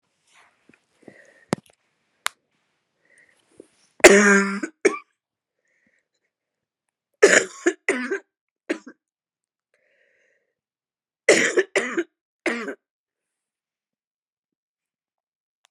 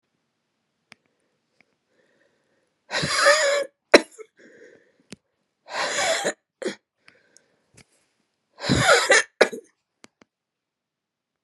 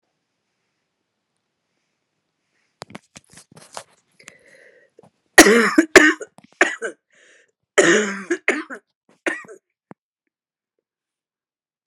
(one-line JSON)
{"three_cough_length": "15.7 s", "three_cough_amplitude": 32768, "three_cough_signal_mean_std_ratio": 0.24, "exhalation_length": "11.4 s", "exhalation_amplitude": 32767, "exhalation_signal_mean_std_ratio": 0.31, "cough_length": "11.9 s", "cough_amplitude": 32768, "cough_signal_mean_std_ratio": 0.24, "survey_phase": "beta (2021-08-13 to 2022-03-07)", "age": "65+", "gender": "Female", "wearing_mask": "No", "symptom_cough_any": true, "symptom_runny_or_blocked_nose": true, "symptom_shortness_of_breath": true, "symptom_fatigue": true, "symptom_headache": true, "smoker_status": "Never smoked", "respiratory_condition_asthma": true, "respiratory_condition_other": false, "recruitment_source": "Test and Trace", "submission_delay": "2 days", "covid_test_result": "Positive", "covid_test_method": "RT-qPCR", "covid_ct_value": 16.4, "covid_ct_gene": "ORF1ab gene", "covid_ct_mean": 16.8, "covid_viral_load": "3100000 copies/ml", "covid_viral_load_category": "High viral load (>1M copies/ml)"}